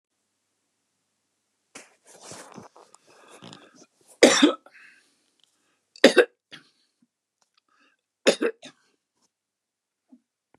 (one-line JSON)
{"three_cough_length": "10.6 s", "three_cough_amplitude": 32767, "three_cough_signal_mean_std_ratio": 0.19, "survey_phase": "beta (2021-08-13 to 2022-03-07)", "age": "65+", "gender": "Male", "wearing_mask": "No", "symptom_none": true, "smoker_status": "Ex-smoker", "respiratory_condition_asthma": false, "respiratory_condition_other": false, "recruitment_source": "REACT", "submission_delay": "2 days", "covid_test_result": "Negative", "covid_test_method": "RT-qPCR", "influenza_a_test_result": "Negative", "influenza_b_test_result": "Negative"}